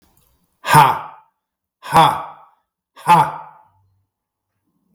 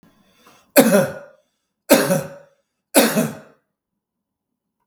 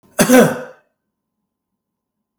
{
  "exhalation_length": "4.9 s",
  "exhalation_amplitude": 32768,
  "exhalation_signal_mean_std_ratio": 0.33,
  "three_cough_length": "4.9 s",
  "three_cough_amplitude": 32768,
  "three_cough_signal_mean_std_ratio": 0.35,
  "cough_length": "2.4 s",
  "cough_amplitude": 32768,
  "cough_signal_mean_std_ratio": 0.31,
  "survey_phase": "beta (2021-08-13 to 2022-03-07)",
  "age": "45-64",
  "gender": "Male",
  "wearing_mask": "No",
  "symptom_cough_any": true,
  "symptom_onset": "5 days",
  "smoker_status": "Never smoked",
  "respiratory_condition_asthma": false,
  "respiratory_condition_other": false,
  "recruitment_source": "REACT",
  "submission_delay": "3 days",
  "covid_test_result": "Negative",
  "covid_test_method": "RT-qPCR",
  "influenza_a_test_result": "Negative",
  "influenza_b_test_result": "Negative"
}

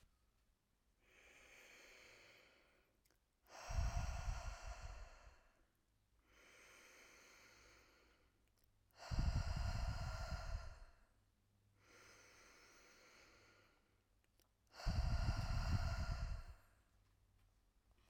{
  "exhalation_length": "18.1 s",
  "exhalation_amplitude": 1409,
  "exhalation_signal_mean_std_ratio": 0.45,
  "survey_phase": "alpha (2021-03-01 to 2021-08-12)",
  "age": "18-44",
  "gender": "Female",
  "wearing_mask": "No",
  "symptom_none": true,
  "smoker_status": "Never smoked",
  "respiratory_condition_asthma": false,
  "respiratory_condition_other": false,
  "recruitment_source": "REACT",
  "submission_delay": "1 day",
  "covid_test_result": "Negative",
  "covid_test_method": "RT-qPCR"
}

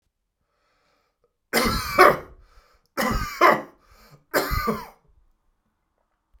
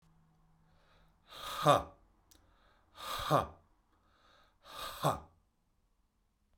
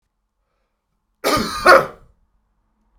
{
  "three_cough_length": "6.4 s",
  "three_cough_amplitude": 32767,
  "three_cough_signal_mean_std_ratio": 0.35,
  "exhalation_length": "6.6 s",
  "exhalation_amplitude": 8781,
  "exhalation_signal_mean_std_ratio": 0.28,
  "cough_length": "3.0 s",
  "cough_amplitude": 32768,
  "cough_signal_mean_std_ratio": 0.29,
  "survey_phase": "beta (2021-08-13 to 2022-03-07)",
  "age": "45-64",
  "gender": "Male",
  "wearing_mask": "No",
  "symptom_none": true,
  "smoker_status": "Ex-smoker",
  "respiratory_condition_asthma": false,
  "respiratory_condition_other": false,
  "recruitment_source": "REACT",
  "submission_delay": "3 days",
  "covid_test_result": "Negative",
  "covid_test_method": "RT-qPCR"
}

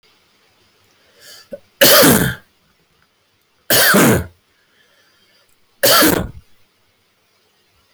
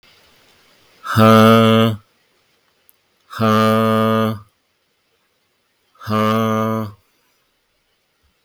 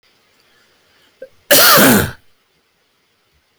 {
  "three_cough_length": "7.9 s",
  "three_cough_amplitude": 32459,
  "three_cough_signal_mean_std_ratio": 0.39,
  "exhalation_length": "8.4 s",
  "exhalation_amplitude": 32768,
  "exhalation_signal_mean_std_ratio": 0.47,
  "cough_length": "3.6 s",
  "cough_amplitude": 32127,
  "cough_signal_mean_std_ratio": 0.37,
  "survey_phase": "beta (2021-08-13 to 2022-03-07)",
  "age": "45-64",
  "gender": "Male",
  "wearing_mask": "No",
  "symptom_sore_throat": true,
  "symptom_fatigue": true,
  "symptom_onset": "12 days",
  "smoker_status": "Never smoked",
  "respiratory_condition_asthma": false,
  "respiratory_condition_other": false,
  "recruitment_source": "REACT",
  "submission_delay": "2 days",
  "covid_test_result": "Negative",
  "covid_test_method": "RT-qPCR"
}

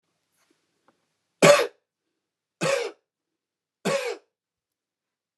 {
  "three_cough_length": "5.4 s",
  "three_cough_amplitude": 28045,
  "three_cough_signal_mean_std_ratio": 0.26,
  "survey_phase": "beta (2021-08-13 to 2022-03-07)",
  "age": "45-64",
  "gender": "Male",
  "wearing_mask": "No",
  "symptom_none": true,
  "smoker_status": "Never smoked",
  "respiratory_condition_asthma": false,
  "respiratory_condition_other": false,
  "recruitment_source": "Test and Trace",
  "submission_delay": "0 days",
  "covid_test_result": "Negative",
  "covid_test_method": "LFT"
}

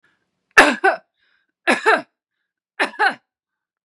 {
  "three_cough_length": "3.8 s",
  "three_cough_amplitude": 32768,
  "three_cough_signal_mean_std_ratio": 0.33,
  "survey_phase": "beta (2021-08-13 to 2022-03-07)",
  "age": "45-64",
  "gender": "Female",
  "wearing_mask": "No",
  "symptom_none": true,
  "symptom_onset": "8 days",
  "smoker_status": "Never smoked",
  "respiratory_condition_asthma": false,
  "respiratory_condition_other": false,
  "recruitment_source": "REACT",
  "submission_delay": "2 days",
  "covid_test_result": "Negative",
  "covid_test_method": "RT-qPCR",
  "influenza_a_test_result": "Negative",
  "influenza_b_test_result": "Negative"
}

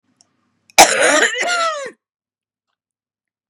{
  "cough_length": "3.5 s",
  "cough_amplitude": 32768,
  "cough_signal_mean_std_ratio": 0.39,
  "survey_phase": "beta (2021-08-13 to 2022-03-07)",
  "age": "45-64",
  "gender": "Female",
  "wearing_mask": "No",
  "symptom_cough_any": true,
  "symptom_runny_or_blocked_nose": true,
  "symptom_shortness_of_breath": true,
  "symptom_sore_throat": true,
  "symptom_abdominal_pain": true,
  "symptom_headache": true,
  "symptom_change_to_sense_of_smell_or_taste": true,
  "symptom_onset": "5 days",
  "smoker_status": "Never smoked",
  "respiratory_condition_asthma": false,
  "respiratory_condition_other": false,
  "recruitment_source": "REACT",
  "submission_delay": "1 day",
  "covid_test_result": "Negative",
  "covid_test_method": "RT-qPCR",
  "influenza_a_test_result": "Unknown/Void",
  "influenza_b_test_result": "Unknown/Void"
}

